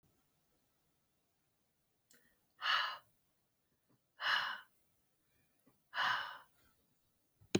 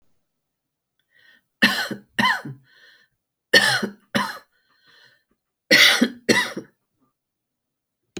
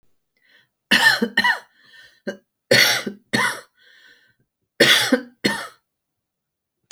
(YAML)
exhalation_length: 7.6 s
exhalation_amplitude: 4444
exhalation_signal_mean_std_ratio: 0.31
three_cough_length: 8.2 s
three_cough_amplitude: 29937
three_cough_signal_mean_std_ratio: 0.33
cough_length: 6.9 s
cough_amplitude: 29296
cough_signal_mean_std_ratio: 0.39
survey_phase: alpha (2021-03-01 to 2021-08-12)
age: 45-64
gender: Female
wearing_mask: 'No'
symptom_fatigue: true
smoker_status: Never smoked
respiratory_condition_asthma: false
respiratory_condition_other: false
recruitment_source: REACT
submission_delay: 2 days
covid_test_result: Negative
covid_test_method: RT-qPCR